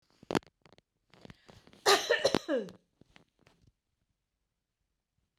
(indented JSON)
{
  "cough_length": "5.4 s",
  "cough_amplitude": 13113,
  "cough_signal_mean_std_ratio": 0.25,
  "survey_phase": "beta (2021-08-13 to 2022-03-07)",
  "age": "45-64",
  "gender": "Female",
  "wearing_mask": "No",
  "symptom_headache": true,
  "symptom_onset": "4 days",
  "smoker_status": "Never smoked",
  "respiratory_condition_asthma": false,
  "respiratory_condition_other": false,
  "recruitment_source": "REACT",
  "submission_delay": "3 days",
  "covid_test_result": "Negative",
  "covid_test_method": "RT-qPCR",
  "influenza_a_test_result": "Negative",
  "influenza_b_test_result": "Negative"
}